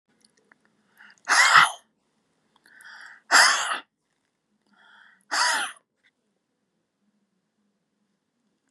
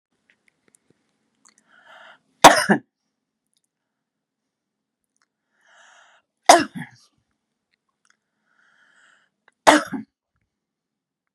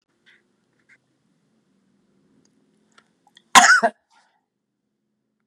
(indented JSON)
{
  "exhalation_length": "8.7 s",
  "exhalation_amplitude": 27183,
  "exhalation_signal_mean_std_ratio": 0.28,
  "three_cough_length": "11.3 s",
  "three_cough_amplitude": 32768,
  "three_cough_signal_mean_std_ratio": 0.17,
  "cough_length": "5.5 s",
  "cough_amplitude": 32768,
  "cough_signal_mean_std_ratio": 0.19,
  "survey_phase": "beta (2021-08-13 to 2022-03-07)",
  "age": "65+",
  "gender": "Female",
  "wearing_mask": "No",
  "symptom_none": true,
  "smoker_status": "Never smoked",
  "respiratory_condition_asthma": false,
  "respiratory_condition_other": false,
  "recruitment_source": "REACT",
  "submission_delay": "2 days",
  "covid_test_result": "Negative",
  "covid_test_method": "RT-qPCR"
}